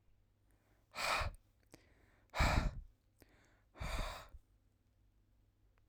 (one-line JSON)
{"exhalation_length": "5.9 s", "exhalation_amplitude": 3243, "exhalation_signal_mean_std_ratio": 0.36, "survey_phase": "alpha (2021-03-01 to 2021-08-12)", "age": "18-44", "gender": "Male", "wearing_mask": "No", "symptom_headache": true, "symptom_onset": "4 days", "smoker_status": "Never smoked", "respiratory_condition_asthma": false, "respiratory_condition_other": false, "recruitment_source": "REACT", "submission_delay": "2 days", "covid_test_result": "Negative", "covid_test_method": "RT-qPCR"}